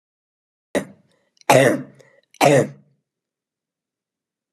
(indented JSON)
{
  "three_cough_length": "4.5 s",
  "three_cough_amplitude": 32767,
  "three_cough_signal_mean_std_ratio": 0.29,
  "survey_phase": "alpha (2021-03-01 to 2021-08-12)",
  "age": "18-44",
  "gender": "Female",
  "wearing_mask": "No",
  "symptom_none": true,
  "smoker_status": "Never smoked",
  "respiratory_condition_asthma": false,
  "respiratory_condition_other": false,
  "recruitment_source": "REACT",
  "submission_delay": "4 days",
  "covid_test_result": "Negative",
  "covid_test_method": "RT-qPCR"
}